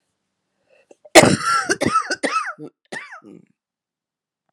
cough_length: 4.5 s
cough_amplitude: 32768
cough_signal_mean_std_ratio: 0.34
survey_phase: beta (2021-08-13 to 2022-03-07)
age: 65+
gender: Female
wearing_mask: 'No'
symptom_cough_any: true
symptom_new_continuous_cough: true
symptom_runny_or_blocked_nose: true
symptom_shortness_of_breath: true
symptom_sore_throat: true
symptom_diarrhoea: true
symptom_fatigue: true
symptom_change_to_sense_of_smell_or_taste: true
symptom_loss_of_taste: true
symptom_onset: 6 days
smoker_status: Never smoked
respiratory_condition_asthma: false
respiratory_condition_other: false
recruitment_source: Test and Trace
submission_delay: 2 days
covid_test_result: Positive
covid_test_method: RT-qPCR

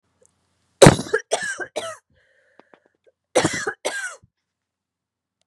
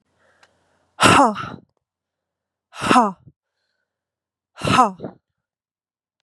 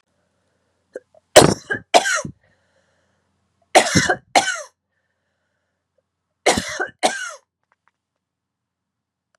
cough_length: 5.5 s
cough_amplitude: 32768
cough_signal_mean_std_ratio: 0.25
exhalation_length: 6.2 s
exhalation_amplitude: 32767
exhalation_signal_mean_std_ratio: 0.3
three_cough_length: 9.4 s
three_cough_amplitude: 32768
three_cough_signal_mean_std_ratio: 0.27
survey_phase: beta (2021-08-13 to 2022-03-07)
age: 18-44
gender: Female
wearing_mask: 'No'
symptom_cough_any: true
symptom_runny_or_blocked_nose: true
symptom_shortness_of_breath: true
symptom_sore_throat: true
symptom_fatigue: true
symptom_other: true
symptom_onset: 3 days
smoker_status: Never smoked
respiratory_condition_asthma: false
respiratory_condition_other: false
recruitment_source: Test and Trace
submission_delay: 2 days
covid_test_result: Positive
covid_test_method: RT-qPCR
covid_ct_value: 30.6
covid_ct_gene: N gene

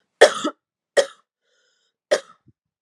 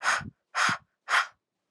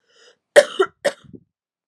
three_cough_length: 2.8 s
three_cough_amplitude: 32768
three_cough_signal_mean_std_ratio: 0.24
exhalation_length: 1.7 s
exhalation_amplitude: 9376
exhalation_signal_mean_std_ratio: 0.48
cough_length: 1.9 s
cough_amplitude: 32768
cough_signal_mean_std_ratio: 0.24
survey_phase: alpha (2021-03-01 to 2021-08-12)
age: 18-44
gender: Female
wearing_mask: 'No'
symptom_cough_any: true
symptom_abdominal_pain: true
symptom_headache: true
smoker_status: Never smoked
respiratory_condition_asthma: false
respiratory_condition_other: false
recruitment_source: Test and Trace
submission_delay: 1 day
covid_test_result: Positive
covid_test_method: RT-qPCR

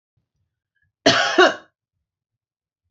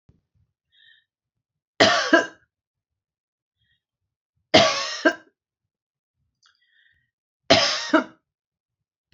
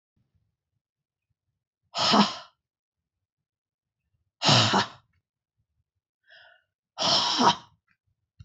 cough_length: 2.9 s
cough_amplitude: 29695
cough_signal_mean_std_ratio: 0.29
three_cough_length: 9.1 s
three_cough_amplitude: 28714
three_cough_signal_mean_std_ratio: 0.28
exhalation_length: 8.4 s
exhalation_amplitude: 18375
exhalation_signal_mean_std_ratio: 0.32
survey_phase: beta (2021-08-13 to 2022-03-07)
age: 65+
gender: Female
wearing_mask: 'No'
symptom_none: true
smoker_status: Never smoked
respiratory_condition_asthma: true
respiratory_condition_other: false
recruitment_source: REACT
submission_delay: 6 days
covid_test_result: Negative
covid_test_method: RT-qPCR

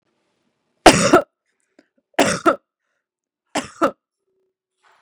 three_cough_length: 5.0 s
three_cough_amplitude: 32768
three_cough_signal_mean_std_ratio: 0.27
survey_phase: beta (2021-08-13 to 2022-03-07)
age: 18-44
gender: Female
wearing_mask: 'No'
symptom_none: true
smoker_status: Ex-smoker
respiratory_condition_asthma: false
respiratory_condition_other: false
recruitment_source: REACT
submission_delay: 3 days
covid_test_result: Negative
covid_test_method: RT-qPCR
influenza_a_test_result: Negative
influenza_b_test_result: Negative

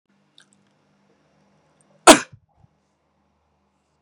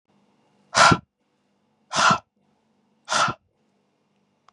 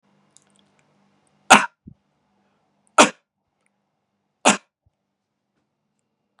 cough_length: 4.0 s
cough_amplitude: 32768
cough_signal_mean_std_ratio: 0.13
exhalation_length: 4.5 s
exhalation_amplitude: 30629
exhalation_signal_mean_std_ratio: 0.3
three_cough_length: 6.4 s
three_cough_amplitude: 32768
three_cough_signal_mean_std_ratio: 0.16
survey_phase: beta (2021-08-13 to 2022-03-07)
age: 65+
gender: Male
wearing_mask: 'No'
symptom_none: true
smoker_status: Ex-smoker
respiratory_condition_asthma: false
respiratory_condition_other: true
recruitment_source: REACT
submission_delay: 1 day
covid_test_result: Negative
covid_test_method: RT-qPCR
influenza_a_test_result: Negative
influenza_b_test_result: Negative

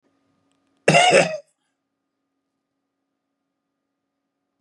cough_length: 4.6 s
cough_amplitude: 30668
cough_signal_mean_std_ratio: 0.25
survey_phase: beta (2021-08-13 to 2022-03-07)
age: 45-64
gender: Male
wearing_mask: 'No'
symptom_none: true
symptom_onset: 6 days
smoker_status: Never smoked
respiratory_condition_asthma: false
respiratory_condition_other: false
recruitment_source: REACT
submission_delay: 2 days
covid_test_result: Negative
covid_test_method: RT-qPCR
influenza_a_test_result: Negative
influenza_b_test_result: Negative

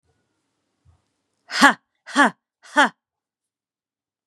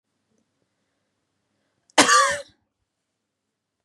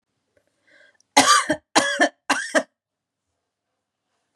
exhalation_length: 4.3 s
exhalation_amplitude: 32767
exhalation_signal_mean_std_ratio: 0.23
cough_length: 3.8 s
cough_amplitude: 32078
cough_signal_mean_std_ratio: 0.24
three_cough_length: 4.4 s
three_cough_amplitude: 31754
three_cough_signal_mean_std_ratio: 0.33
survey_phase: beta (2021-08-13 to 2022-03-07)
age: 18-44
gender: Female
wearing_mask: 'No'
symptom_cough_any: true
smoker_status: Never smoked
respiratory_condition_asthma: false
respiratory_condition_other: false
recruitment_source: Test and Trace
submission_delay: 1 day
covid_test_result: Positive
covid_test_method: LFT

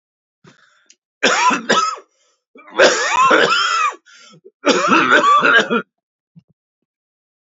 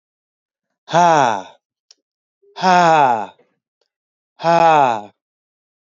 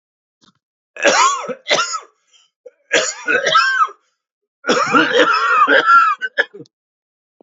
three_cough_length: 7.4 s
three_cough_amplitude: 30931
three_cough_signal_mean_std_ratio: 0.55
exhalation_length: 5.9 s
exhalation_amplitude: 32554
exhalation_signal_mean_std_ratio: 0.42
cough_length: 7.4 s
cough_amplitude: 31702
cough_signal_mean_std_ratio: 0.56
survey_phase: alpha (2021-03-01 to 2021-08-12)
age: 45-64
gender: Male
wearing_mask: 'No'
symptom_none: true
smoker_status: Never smoked
respiratory_condition_asthma: true
respiratory_condition_other: false
recruitment_source: Test and Trace
submission_delay: 2 days
covid_test_result: Positive
covid_test_method: RT-qPCR
covid_ct_value: 20.8
covid_ct_gene: ORF1ab gene
covid_ct_mean: 21.0
covid_viral_load: 130000 copies/ml
covid_viral_load_category: Low viral load (10K-1M copies/ml)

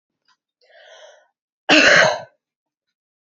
cough_length: 3.2 s
cough_amplitude: 29354
cough_signal_mean_std_ratio: 0.32
survey_phase: beta (2021-08-13 to 2022-03-07)
age: 18-44
gender: Female
wearing_mask: 'No'
symptom_fatigue: true
symptom_headache: true
symptom_onset: 11 days
smoker_status: Never smoked
respiratory_condition_asthma: false
respiratory_condition_other: false
recruitment_source: REACT
submission_delay: 3 days
covid_test_result: Negative
covid_test_method: RT-qPCR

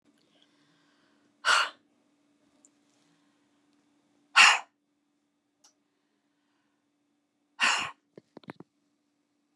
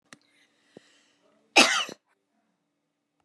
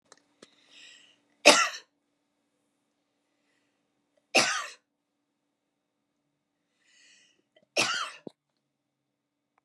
exhalation_length: 9.6 s
exhalation_amplitude: 22114
exhalation_signal_mean_std_ratio: 0.2
cough_length: 3.2 s
cough_amplitude: 23990
cough_signal_mean_std_ratio: 0.21
three_cough_length: 9.6 s
three_cough_amplitude: 27499
three_cough_signal_mean_std_ratio: 0.2
survey_phase: beta (2021-08-13 to 2022-03-07)
age: 45-64
gender: Female
wearing_mask: 'No'
symptom_none: true
smoker_status: Ex-smoker
respiratory_condition_asthma: false
respiratory_condition_other: false
recruitment_source: REACT
submission_delay: 4 days
covid_test_result: Negative
covid_test_method: RT-qPCR
influenza_a_test_result: Negative
influenza_b_test_result: Negative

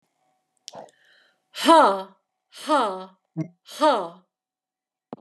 exhalation_length: 5.2 s
exhalation_amplitude: 23368
exhalation_signal_mean_std_ratio: 0.35
survey_phase: beta (2021-08-13 to 2022-03-07)
age: 18-44
gender: Male
wearing_mask: 'No'
symptom_runny_or_blocked_nose: true
symptom_fatigue: true
symptom_other: true
smoker_status: Never smoked
respiratory_condition_asthma: false
respiratory_condition_other: false
recruitment_source: Test and Trace
submission_delay: 3 days
covid_test_result: Positive
covid_test_method: RT-qPCR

